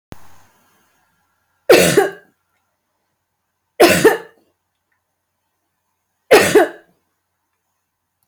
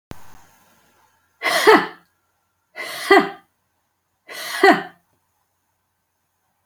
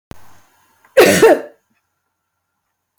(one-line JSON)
{"three_cough_length": "8.3 s", "three_cough_amplitude": 30732, "three_cough_signal_mean_std_ratio": 0.29, "exhalation_length": "6.7 s", "exhalation_amplitude": 30003, "exhalation_signal_mean_std_ratio": 0.29, "cough_length": "3.0 s", "cough_amplitude": 31721, "cough_signal_mean_std_ratio": 0.32, "survey_phase": "alpha (2021-03-01 to 2021-08-12)", "age": "18-44", "gender": "Female", "wearing_mask": "No", "symptom_none": true, "smoker_status": "Never smoked", "respiratory_condition_asthma": false, "respiratory_condition_other": false, "recruitment_source": "REACT", "submission_delay": "6 days", "covid_test_result": "Negative", "covid_test_method": "RT-qPCR"}